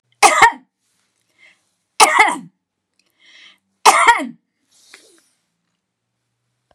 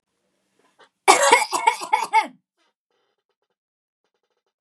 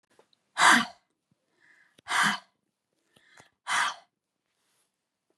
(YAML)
three_cough_length: 6.7 s
three_cough_amplitude: 32768
three_cough_signal_mean_std_ratio: 0.3
cough_length: 4.6 s
cough_amplitude: 32521
cough_signal_mean_std_ratio: 0.31
exhalation_length: 5.4 s
exhalation_amplitude: 15925
exhalation_signal_mean_std_ratio: 0.29
survey_phase: beta (2021-08-13 to 2022-03-07)
age: 45-64
gender: Female
wearing_mask: 'No'
symptom_none: true
smoker_status: Ex-smoker
respiratory_condition_asthma: false
respiratory_condition_other: false
recruitment_source: REACT
submission_delay: 2 days
covid_test_result: Negative
covid_test_method: RT-qPCR
influenza_a_test_result: Negative
influenza_b_test_result: Negative